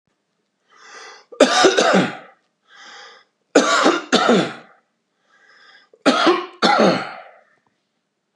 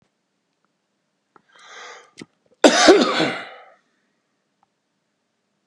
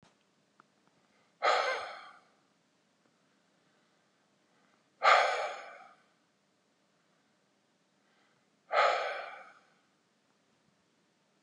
{"three_cough_length": "8.4 s", "three_cough_amplitude": 32768, "three_cough_signal_mean_std_ratio": 0.44, "cough_length": "5.7 s", "cough_amplitude": 32768, "cough_signal_mean_std_ratio": 0.27, "exhalation_length": "11.4 s", "exhalation_amplitude": 12101, "exhalation_signal_mean_std_ratio": 0.28, "survey_phase": "beta (2021-08-13 to 2022-03-07)", "age": "45-64", "gender": "Male", "wearing_mask": "No", "symptom_none": true, "smoker_status": "Never smoked", "respiratory_condition_asthma": false, "respiratory_condition_other": false, "recruitment_source": "REACT", "submission_delay": "3 days", "covid_test_result": "Negative", "covid_test_method": "RT-qPCR", "influenza_a_test_result": "Negative", "influenza_b_test_result": "Negative"}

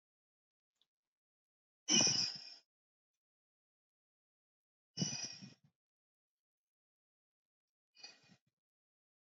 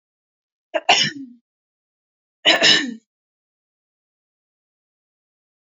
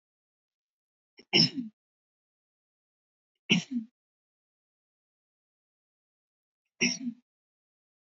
{"exhalation_length": "9.2 s", "exhalation_amplitude": 4333, "exhalation_signal_mean_std_ratio": 0.22, "cough_length": "5.7 s", "cough_amplitude": 32339, "cough_signal_mean_std_ratio": 0.27, "three_cough_length": "8.1 s", "three_cough_amplitude": 12098, "three_cough_signal_mean_std_ratio": 0.21, "survey_phase": "alpha (2021-03-01 to 2021-08-12)", "age": "18-44", "gender": "Female", "wearing_mask": "No", "symptom_none": true, "smoker_status": "Never smoked", "respiratory_condition_asthma": false, "respiratory_condition_other": false, "recruitment_source": "REACT", "submission_delay": "3 days", "covid_test_result": "Negative", "covid_test_method": "RT-qPCR"}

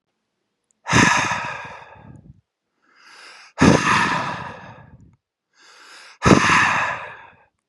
{"exhalation_length": "7.7 s", "exhalation_amplitude": 32768, "exhalation_signal_mean_std_ratio": 0.43, "survey_phase": "beta (2021-08-13 to 2022-03-07)", "age": "18-44", "gender": "Male", "wearing_mask": "No", "symptom_none": true, "smoker_status": "Ex-smoker", "respiratory_condition_asthma": false, "respiratory_condition_other": false, "recruitment_source": "REACT", "submission_delay": "1 day", "covid_test_result": "Negative", "covid_test_method": "RT-qPCR", "influenza_a_test_result": "Negative", "influenza_b_test_result": "Negative"}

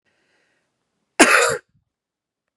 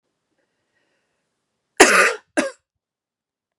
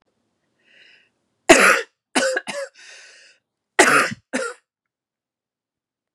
{"exhalation_length": "2.6 s", "exhalation_amplitude": 32767, "exhalation_signal_mean_std_ratio": 0.28, "cough_length": "3.6 s", "cough_amplitude": 32768, "cough_signal_mean_std_ratio": 0.25, "three_cough_length": "6.1 s", "three_cough_amplitude": 32768, "three_cough_signal_mean_std_ratio": 0.31, "survey_phase": "beta (2021-08-13 to 2022-03-07)", "age": "45-64", "gender": "Female", "wearing_mask": "No", "symptom_none": true, "symptom_onset": "10 days", "smoker_status": "Never smoked", "respiratory_condition_asthma": false, "respiratory_condition_other": false, "recruitment_source": "REACT", "submission_delay": "4 days", "covid_test_result": "Negative", "covid_test_method": "RT-qPCR", "influenza_a_test_result": "Negative", "influenza_b_test_result": "Negative"}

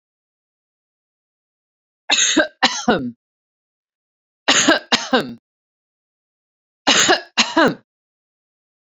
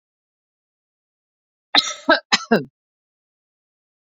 {"three_cough_length": "8.9 s", "three_cough_amplitude": 32767, "three_cough_signal_mean_std_ratio": 0.35, "cough_length": "4.1 s", "cough_amplitude": 29024, "cough_signal_mean_std_ratio": 0.23, "survey_phase": "beta (2021-08-13 to 2022-03-07)", "age": "45-64", "gender": "Female", "wearing_mask": "No", "symptom_none": true, "smoker_status": "Ex-smoker", "respiratory_condition_asthma": false, "respiratory_condition_other": false, "recruitment_source": "REACT", "submission_delay": "1 day", "covid_test_result": "Negative", "covid_test_method": "RT-qPCR", "influenza_a_test_result": "Negative", "influenza_b_test_result": "Negative"}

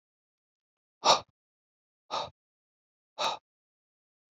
{"exhalation_length": "4.4 s", "exhalation_amplitude": 12830, "exhalation_signal_mean_std_ratio": 0.22, "survey_phase": "beta (2021-08-13 to 2022-03-07)", "age": "45-64", "gender": "Male", "wearing_mask": "No", "symptom_cough_any": true, "symptom_onset": "12 days", "smoker_status": "Never smoked", "respiratory_condition_asthma": false, "respiratory_condition_other": false, "recruitment_source": "REACT", "submission_delay": "2 days", "covid_test_result": "Negative", "covid_test_method": "RT-qPCR"}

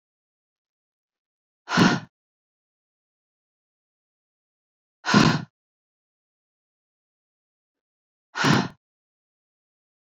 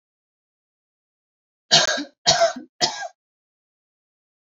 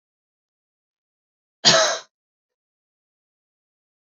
{"exhalation_length": "10.2 s", "exhalation_amplitude": 24541, "exhalation_signal_mean_std_ratio": 0.22, "three_cough_length": "4.5 s", "three_cough_amplitude": 27961, "three_cough_signal_mean_std_ratio": 0.3, "cough_length": "4.0 s", "cough_amplitude": 32102, "cough_signal_mean_std_ratio": 0.21, "survey_phase": "beta (2021-08-13 to 2022-03-07)", "age": "18-44", "gender": "Female", "wearing_mask": "No", "symptom_none": true, "smoker_status": "Never smoked", "respiratory_condition_asthma": false, "respiratory_condition_other": false, "recruitment_source": "REACT", "submission_delay": "1 day", "covid_test_result": "Negative", "covid_test_method": "RT-qPCR"}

